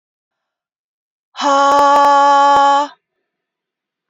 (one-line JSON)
{"exhalation_length": "4.1 s", "exhalation_amplitude": 27745, "exhalation_signal_mean_std_ratio": 0.5, "survey_phase": "beta (2021-08-13 to 2022-03-07)", "age": "45-64", "gender": "Female", "wearing_mask": "No", "symptom_none": true, "smoker_status": "Never smoked", "respiratory_condition_asthma": false, "respiratory_condition_other": false, "recruitment_source": "REACT", "submission_delay": "0 days", "covid_test_result": "Negative", "covid_test_method": "RT-qPCR", "influenza_a_test_result": "Negative", "influenza_b_test_result": "Negative"}